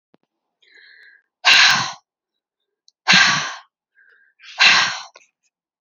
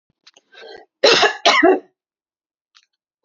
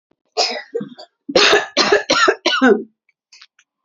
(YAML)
exhalation_length: 5.8 s
exhalation_amplitude: 32767
exhalation_signal_mean_std_ratio: 0.37
cough_length: 3.2 s
cough_amplitude: 32767
cough_signal_mean_std_ratio: 0.37
three_cough_length: 3.8 s
three_cough_amplitude: 32457
three_cough_signal_mean_std_ratio: 0.51
survey_phase: beta (2021-08-13 to 2022-03-07)
age: 45-64
gender: Female
wearing_mask: 'No'
symptom_runny_or_blocked_nose: true
smoker_status: Current smoker (e-cigarettes or vapes only)
respiratory_condition_asthma: false
respiratory_condition_other: false
recruitment_source: REACT
submission_delay: 1 day
covid_test_result: Negative
covid_test_method: RT-qPCR
influenza_a_test_result: Negative
influenza_b_test_result: Negative